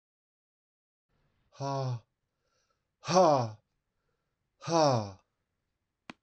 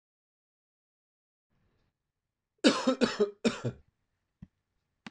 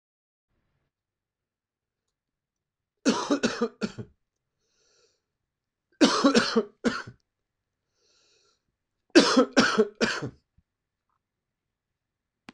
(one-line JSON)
{"exhalation_length": "6.2 s", "exhalation_amplitude": 9904, "exhalation_signal_mean_std_ratio": 0.33, "cough_length": "5.1 s", "cough_amplitude": 13149, "cough_signal_mean_std_ratio": 0.27, "three_cough_length": "12.5 s", "three_cough_amplitude": 22155, "three_cough_signal_mean_std_ratio": 0.29, "survey_phase": "beta (2021-08-13 to 2022-03-07)", "age": "45-64", "gender": "Male", "wearing_mask": "No", "symptom_cough_any": true, "symptom_runny_or_blocked_nose": true, "symptom_fatigue": true, "symptom_headache": true, "symptom_onset": "4 days", "smoker_status": "Never smoked", "respiratory_condition_asthma": false, "respiratory_condition_other": false, "recruitment_source": "Test and Trace", "submission_delay": "2 days", "covid_test_result": "Positive", "covid_test_method": "RT-qPCR"}